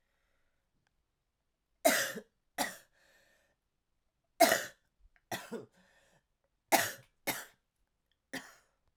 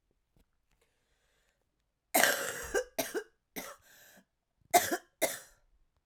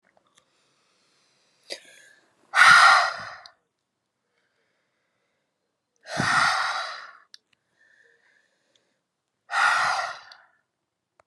{"three_cough_length": "9.0 s", "three_cough_amplitude": 10640, "three_cough_signal_mean_std_ratio": 0.25, "cough_length": "6.1 s", "cough_amplitude": 17661, "cough_signal_mean_std_ratio": 0.31, "exhalation_length": "11.3 s", "exhalation_amplitude": 24571, "exhalation_signal_mean_std_ratio": 0.31, "survey_phase": "alpha (2021-03-01 to 2021-08-12)", "age": "45-64", "gender": "Female", "wearing_mask": "No", "symptom_cough_any": true, "symptom_fatigue": true, "symptom_fever_high_temperature": true, "symptom_headache": true, "symptom_change_to_sense_of_smell_or_taste": true, "symptom_loss_of_taste": true, "symptom_onset": "9 days", "smoker_status": "Current smoker (1 to 10 cigarettes per day)", "respiratory_condition_asthma": false, "respiratory_condition_other": false, "recruitment_source": "Test and Trace", "submission_delay": "2 days", "covid_test_result": "Positive", "covid_test_method": "RT-qPCR"}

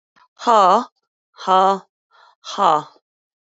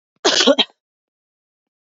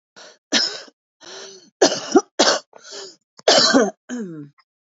{"exhalation_length": "3.4 s", "exhalation_amplitude": 28213, "exhalation_signal_mean_std_ratio": 0.4, "cough_length": "1.9 s", "cough_amplitude": 27588, "cough_signal_mean_std_ratio": 0.33, "three_cough_length": "4.9 s", "three_cough_amplitude": 32768, "three_cough_signal_mean_std_ratio": 0.41, "survey_phase": "beta (2021-08-13 to 2022-03-07)", "age": "45-64", "gender": "Female", "wearing_mask": "No", "symptom_new_continuous_cough": true, "symptom_fatigue": true, "symptom_loss_of_taste": true, "symptom_onset": "4 days", "smoker_status": "Current smoker (1 to 10 cigarettes per day)", "respiratory_condition_asthma": false, "respiratory_condition_other": false, "recruitment_source": "Test and Trace", "submission_delay": "3 days", "covid_test_result": "Positive", "covid_test_method": "RT-qPCR", "covid_ct_value": 16.1, "covid_ct_gene": "ORF1ab gene", "covid_ct_mean": 16.4, "covid_viral_load": "4100000 copies/ml", "covid_viral_load_category": "High viral load (>1M copies/ml)"}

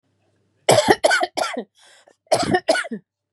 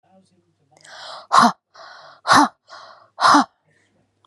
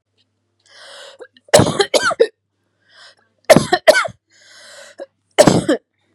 {"cough_length": "3.3 s", "cough_amplitude": 32642, "cough_signal_mean_std_ratio": 0.45, "exhalation_length": "4.3 s", "exhalation_amplitude": 31958, "exhalation_signal_mean_std_ratio": 0.33, "three_cough_length": "6.1 s", "three_cough_amplitude": 32768, "three_cough_signal_mean_std_ratio": 0.34, "survey_phase": "beta (2021-08-13 to 2022-03-07)", "age": "18-44", "gender": "Female", "wearing_mask": "No", "symptom_none": true, "symptom_onset": "6 days", "smoker_status": "Ex-smoker", "respiratory_condition_asthma": false, "respiratory_condition_other": false, "recruitment_source": "REACT", "submission_delay": "1 day", "covid_test_result": "Negative", "covid_test_method": "RT-qPCR", "influenza_a_test_result": "Negative", "influenza_b_test_result": "Negative"}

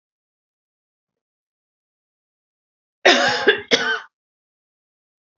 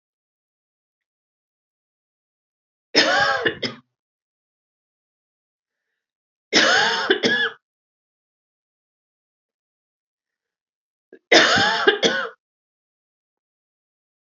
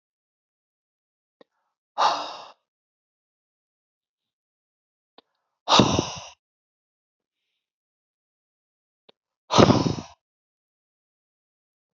{"cough_length": "5.4 s", "cough_amplitude": 32767, "cough_signal_mean_std_ratio": 0.28, "three_cough_length": "14.3 s", "three_cough_amplitude": 30831, "three_cough_signal_mean_std_ratio": 0.31, "exhalation_length": "11.9 s", "exhalation_amplitude": 27444, "exhalation_signal_mean_std_ratio": 0.22, "survey_phase": "alpha (2021-03-01 to 2021-08-12)", "age": "18-44", "gender": "Female", "wearing_mask": "No", "symptom_none": true, "smoker_status": "Never smoked", "respiratory_condition_asthma": false, "respiratory_condition_other": false, "recruitment_source": "REACT", "submission_delay": "1 day", "covid_test_result": "Negative", "covid_test_method": "RT-qPCR"}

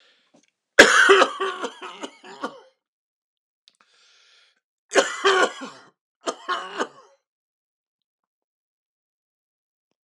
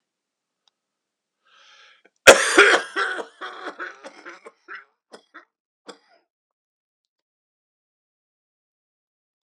{"three_cough_length": "10.0 s", "three_cough_amplitude": 32768, "three_cough_signal_mean_std_ratio": 0.28, "cough_length": "9.6 s", "cough_amplitude": 32768, "cough_signal_mean_std_ratio": 0.2, "survey_phase": "alpha (2021-03-01 to 2021-08-12)", "age": "45-64", "gender": "Male", "wearing_mask": "No", "symptom_cough_any": true, "symptom_fatigue": true, "symptom_fever_high_temperature": true, "symptom_headache": true, "symptom_change_to_sense_of_smell_or_taste": true, "symptom_onset": "5 days", "smoker_status": "Current smoker (e-cigarettes or vapes only)", "respiratory_condition_asthma": true, "respiratory_condition_other": false, "recruitment_source": "Test and Trace", "submission_delay": "2 days", "covid_test_result": "Positive", "covid_test_method": "RT-qPCR", "covid_ct_value": 20.7, "covid_ct_gene": "N gene", "covid_ct_mean": 21.2, "covid_viral_load": "110000 copies/ml", "covid_viral_load_category": "Low viral load (10K-1M copies/ml)"}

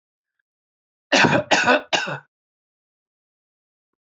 {"cough_length": "4.1 s", "cough_amplitude": 30783, "cough_signal_mean_std_ratio": 0.34, "survey_phase": "alpha (2021-03-01 to 2021-08-12)", "age": "65+", "gender": "Male", "wearing_mask": "No", "symptom_none": true, "smoker_status": "Never smoked", "respiratory_condition_asthma": false, "respiratory_condition_other": false, "recruitment_source": "REACT", "submission_delay": "1 day", "covid_test_result": "Negative", "covid_test_method": "RT-qPCR"}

